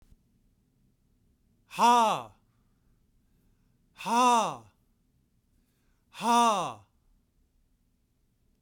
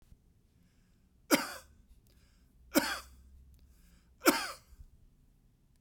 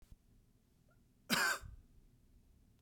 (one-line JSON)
{"exhalation_length": "8.6 s", "exhalation_amplitude": 9745, "exhalation_signal_mean_std_ratio": 0.32, "three_cough_length": "5.8 s", "three_cough_amplitude": 11467, "three_cough_signal_mean_std_ratio": 0.26, "cough_length": "2.8 s", "cough_amplitude": 3299, "cough_signal_mean_std_ratio": 0.32, "survey_phase": "beta (2021-08-13 to 2022-03-07)", "age": "45-64", "gender": "Male", "wearing_mask": "No", "symptom_none": true, "smoker_status": "Never smoked", "respiratory_condition_asthma": true, "respiratory_condition_other": false, "recruitment_source": "REACT", "submission_delay": "2 days", "covid_test_result": "Negative", "covid_test_method": "RT-qPCR", "influenza_a_test_result": "Unknown/Void", "influenza_b_test_result": "Unknown/Void"}